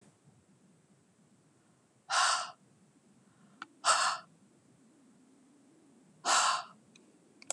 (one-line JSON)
{"exhalation_length": "7.5 s", "exhalation_amplitude": 7055, "exhalation_signal_mean_std_ratio": 0.33, "survey_phase": "beta (2021-08-13 to 2022-03-07)", "age": "45-64", "gender": "Female", "wearing_mask": "No", "symptom_none": true, "smoker_status": "Never smoked", "respiratory_condition_asthma": false, "respiratory_condition_other": false, "recruitment_source": "REACT", "submission_delay": "3 days", "covid_test_result": "Negative", "covid_test_method": "RT-qPCR"}